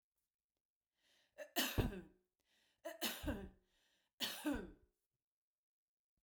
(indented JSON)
{
  "three_cough_length": "6.2 s",
  "three_cough_amplitude": 2228,
  "three_cough_signal_mean_std_ratio": 0.36,
  "survey_phase": "beta (2021-08-13 to 2022-03-07)",
  "age": "45-64",
  "gender": "Female",
  "wearing_mask": "No",
  "symptom_none": true,
  "smoker_status": "Ex-smoker",
  "respiratory_condition_asthma": false,
  "respiratory_condition_other": false,
  "recruitment_source": "REACT",
  "submission_delay": "1 day",
  "covid_test_result": "Negative",
  "covid_test_method": "RT-qPCR"
}